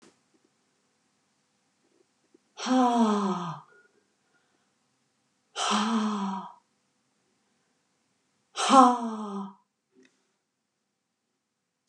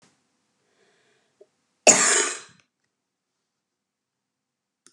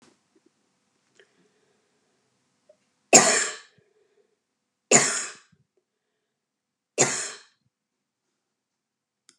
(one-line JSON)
{"exhalation_length": "11.9 s", "exhalation_amplitude": 21198, "exhalation_signal_mean_std_ratio": 0.33, "cough_length": "4.9 s", "cough_amplitude": 31928, "cough_signal_mean_std_ratio": 0.22, "three_cough_length": "9.4 s", "three_cough_amplitude": 32760, "three_cough_signal_mean_std_ratio": 0.22, "survey_phase": "beta (2021-08-13 to 2022-03-07)", "age": "65+", "gender": "Female", "wearing_mask": "No", "symptom_none": true, "smoker_status": "Never smoked", "respiratory_condition_asthma": false, "respiratory_condition_other": false, "recruitment_source": "REACT", "submission_delay": "7 days", "covid_test_result": "Negative", "covid_test_method": "RT-qPCR", "influenza_a_test_result": "Negative", "influenza_b_test_result": "Negative"}